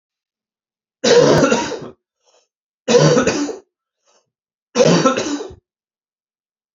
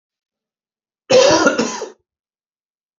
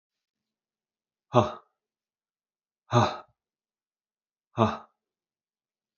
three_cough_length: 6.7 s
three_cough_amplitude: 32767
three_cough_signal_mean_std_ratio: 0.44
cough_length: 3.0 s
cough_amplitude: 30928
cough_signal_mean_std_ratio: 0.37
exhalation_length: 6.0 s
exhalation_amplitude: 21094
exhalation_signal_mean_std_ratio: 0.21
survey_phase: beta (2021-08-13 to 2022-03-07)
age: 18-44
gender: Male
wearing_mask: 'No'
symptom_cough_any: true
symptom_sore_throat: true
symptom_onset: 4 days
smoker_status: Never smoked
respiratory_condition_asthma: false
respiratory_condition_other: false
recruitment_source: Test and Trace
submission_delay: 2 days
covid_test_result: Positive
covid_test_method: ePCR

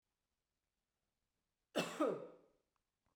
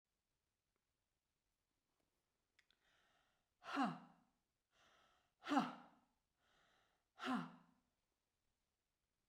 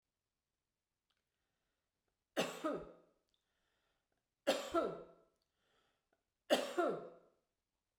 cough_length: 3.2 s
cough_amplitude: 1846
cough_signal_mean_std_ratio: 0.28
exhalation_length: 9.3 s
exhalation_amplitude: 1890
exhalation_signal_mean_std_ratio: 0.24
three_cough_length: 8.0 s
three_cough_amplitude: 3653
three_cough_signal_mean_std_ratio: 0.31
survey_phase: beta (2021-08-13 to 2022-03-07)
age: 45-64
gender: Female
wearing_mask: 'No'
symptom_none: true
smoker_status: Never smoked
respiratory_condition_asthma: false
respiratory_condition_other: false
recruitment_source: REACT
submission_delay: 1 day
covid_test_result: Negative
covid_test_method: RT-qPCR
influenza_a_test_result: Negative
influenza_b_test_result: Negative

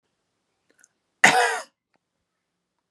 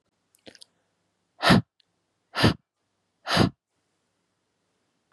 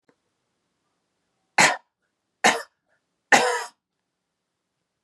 cough_length: 2.9 s
cough_amplitude: 31762
cough_signal_mean_std_ratio: 0.25
exhalation_length: 5.1 s
exhalation_amplitude: 19085
exhalation_signal_mean_std_ratio: 0.25
three_cough_length: 5.0 s
three_cough_amplitude: 27357
three_cough_signal_mean_std_ratio: 0.25
survey_phase: beta (2021-08-13 to 2022-03-07)
age: 18-44
gender: Female
wearing_mask: 'No'
symptom_none: true
smoker_status: Never smoked
respiratory_condition_asthma: false
respiratory_condition_other: false
recruitment_source: REACT
submission_delay: 0 days
covid_test_result: Negative
covid_test_method: RT-qPCR
influenza_a_test_result: Unknown/Void
influenza_b_test_result: Unknown/Void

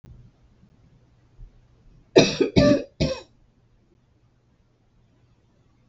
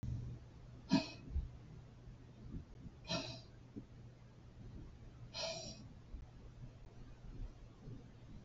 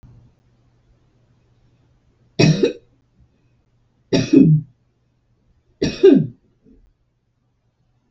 cough_length: 5.9 s
cough_amplitude: 32323
cough_signal_mean_std_ratio: 0.27
exhalation_length: 8.4 s
exhalation_amplitude: 2811
exhalation_signal_mean_std_ratio: 0.6
three_cough_length: 8.1 s
three_cough_amplitude: 32462
three_cough_signal_mean_std_ratio: 0.29
survey_phase: beta (2021-08-13 to 2022-03-07)
age: 65+
gender: Female
wearing_mask: 'No'
symptom_none: true
smoker_status: Ex-smoker
respiratory_condition_asthma: false
respiratory_condition_other: false
recruitment_source: REACT
submission_delay: 0 days
covid_test_result: Negative
covid_test_method: RT-qPCR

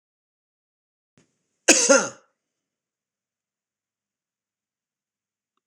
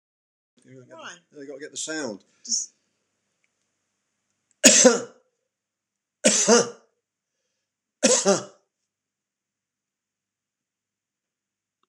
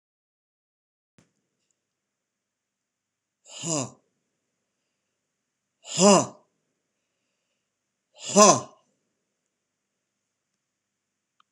cough_length: 5.7 s
cough_amplitude: 26028
cough_signal_mean_std_ratio: 0.18
three_cough_length: 11.9 s
three_cough_amplitude: 26028
three_cough_signal_mean_std_ratio: 0.27
exhalation_length: 11.5 s
exhalation_amplitude: 26027
exhalation_signal_mean_std_ratio: 0.18
survey_phase: alpha (2021-03-01 to 2021-08-12)
age: 65+
gender: Male
wearing_mask: 'No'
symptom_none: true
smoker_status: Ex-smoker
respiratory_condition_asthma: false
respiratory_condition_other: false
recruitment_source: REACT
submission_delay: 3 days
covid_test_result: Negative
covid_test_method: RT-qPCR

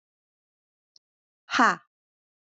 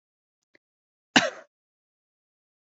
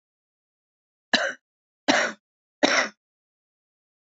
exhalation_length: 2.6 s
exhalation_amplitude: 16232
exhalation_signal_mean_std_ratio: 0.21
cough_length: 2.7 s
cough_amplitude: 26513
cough_signal_mean_std_ratio: 0.15
three_cough_length: 4.2 s
three_cough_amplitude: 22739
three_cough_signal_mean_std_ratio: 0.29
survey_phase: alpha (2021-03-01 to 2021-08-12)
age: 45-64
gender: Female
wearing_mask: 'No'
symptom_cough_any: true
symptom_change_to_sense_of_smell_or_taste: true
symptom_loss_of_taste: true
smoker_status: Ex-smoker
respiratory_condition_asthma: false
respiratory_condition_other: false
recruitment_source: Test and Trace
submission_delay: 2 days
covid_test_result: Positive
covid_test_method: RT-qPCR
covid_ct_value: 18.3
covid_ct_gene: ORF1ab gene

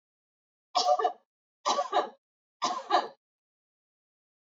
three_cough_length: 4.4 s
three_cough_amplitude: 8190
three_cough_signal_mean_std_ratio: 0.38
survey_phase: beta (2021-08-13 to 2022-03-07)
age: 45-64
gender: Female
wearing_mask: 'No'
symptom_none: true
smoker_status: Never smoked
respiratory_condition_asthma: false
respiratory_condition_other: false
recruitment_source: REACT
submission_delay: 1 day
covid_test_result: Negative
covid_test_method: RT-qPCR
influenza_a_test_result: Negative
influenza_b_test_result: Negative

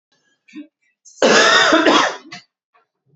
cough_length: 3.2 s
cough_amplitude: 30770
cough_signal_mean_std_ratio: 0.48
survey_phase: beta (2021-08-13 to 2022-03-07)
age: 18-44
gender: Male
wearing_mask: 'No'
symptom_cough_any: true
symptom_runny_or_blocked_nose: true
symptom_sore_throat: true
symptom_change_to_sense_of_smell_or_taste: true
symptom_loss_of_taste: true
symptom_onset: 5 days
smoker_status: Never smoked
respiratory_condition_asthma: true
respiratory_condition_other: false
recruitment_source: Test and Trace
submission_delay: 2 days
covid_test_result: Positive
covid_test_method: RT-qPCR
covid_ct_value: 13.0
covid_ct_gene: ORF1ab gene
covid_ct_mean: 13.4
covid_viral_load: 41000000 copies/ml
covid_viral_load_category: High viral load (>1M copies/ml)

